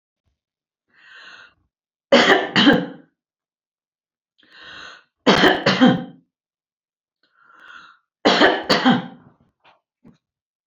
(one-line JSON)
{"three_cough_length": "10.7 s", "three_cough_amplitude": 32767, "three_cough_signal_mean_std_ratio": 0.35, "survey_phase": "beta (2021-08-13 to 2022-03-07)", "age": "65+", "gender": "Female", "wearing_mask": "No", "symptom_none": true, "smoker_status": "Never smoked", "respiratory_condition_asthma": false, "respiratory_condition_other": false, "recruitment_source": "REACT", "submission_delay": "1 day", "covid_test_result": "Negative", "covid_test_method": "RT-qPCR", "influenza_a_test_result": "Negative", "influenza_b_test_result": "Negative"}